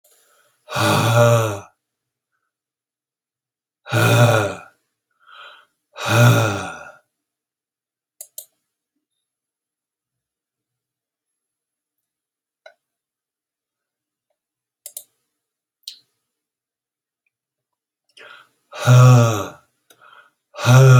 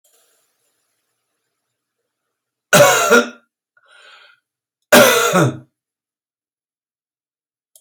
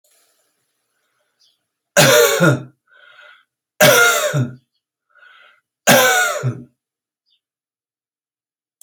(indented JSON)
{
  "exhalation_length": "21.0 s",
  "exhalation_amplitude": 29238,
  "exhalation_signal_mean_std_ratio": 0.3,
  "cough_length": "7.8 s",
  "cough_amplitude": 32768,
  "cough_signal_mean_std_ratio": 0.3,
  "three_cough_length": "8.8 s",
  "three_cough_amplitude": 32768,
  "three_cough_signal_mean_std_ratio": 0.38,
  "survey_phase": "alpha (2021-03-01 to 2021-08-12)",
  "age": "65+",
  "gender": "Male",
  "wearing_mask": "No",
  "symptom_none": true,
  "smoker_status": "Ex-smoker",
  "respiratory_condition_asthma": false,
  "respiratory_condition_other": false,
  "recruitment_source": "REACT",
  "submission_delay": "3 days",
  "covid_test_result": "Negative",
  "covid_test_method": "RT-qPCR"
}